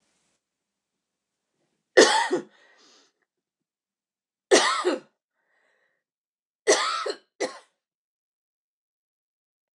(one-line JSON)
{"three_cough_length": "9.8 s", "three_cough_amplitude": 29096, "three_cough_signal_mean_std_ratio": 0.26, "survey_phase": "beta (2021-08-13 to 2022-03-07)", "age": "45-64", "gender": "Female", "wearing_mask": "No", "symptom_cough_any": true, "symptom_runny_or_blocked_nose": true, "symptom_sore_throat": true, "symptom_diarrhoea": true, "symptom_fatigue": true, "symptom_headache": true, "symptom_change_to_sense_of_smell_or_taste": true, "symptom_loss_of_taste": true, "symptom_onset": "3 days", "smoker_status": "Current smoker (e-cigarettes or vapes only)", "respiratory_condition_asthma": false, "respiratory_condition_other": false, "recruitment_source": "Test and Trace", "submission_delay": "2 days", "covid_test_result": "Positive", "covid_test_method": "RT-qPCR"}